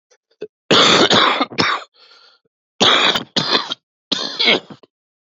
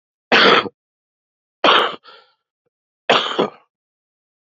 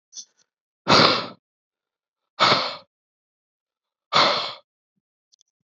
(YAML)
cough_length: 5.2 s
cough_amplitude: 32768
cough_signal_mean_std_ratio: 0.52
three_cough_length: 4.5 s
three_cough_amplitude: 29048
three_cough_signal_mean_std_ratio: 0.35
exhalation_length: 5.7 s
exhalation_amplitude: 26787
exhalation_signal_mean_std_ratio: 0.33
survey_phase: beta (2021-08-13 to 2022-03-07)
age: 18-44
gender: Male
wearing_mask: 'No'
symptom_cough_any: true
symptom_runny_or_blocked_nose: true
symptom_sore_throat: true
symptom_fatigue: true
symptom_fever_high_temperature: true
symptom_headache: true
symptom_other: true
symptom_onset: 4 days
smoker_status: Current smoker (e-cigarettes or vapes only)
respiratory_condition_asthma: false
respiratory_condition_other: false
recruitment_source: Test and Trace
submission_delay: 2 days
covid_test_result: Positive
covid_test_method: RT-qPCR